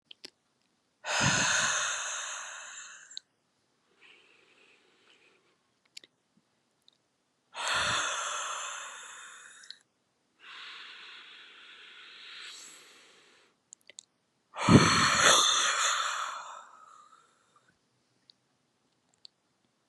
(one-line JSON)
{"exhalation_length": "19.9 s", "exhalation_amplitude": 18068, "exhalation_signal_mean_std_ratio": 0.37, "survey_phase": "beta (2021-08-13 to 2022-03-07)", "age": "45-64", "gender": "Female", "wearing_mask": "No", "symptom_cough_any": true, "symptom_sore_throat": true, "symptom_abdominal_pain": true, "symptom_fatigue": true, "smoker_status": "Never smoked", "respiratory_condition_asthma": false, "respiratory_condition_other": false, "recruitment_source": "Test and Trace", "submission_delay": "1 day", "covid_test_result": "Positive", "covid_test_method": "LFT"}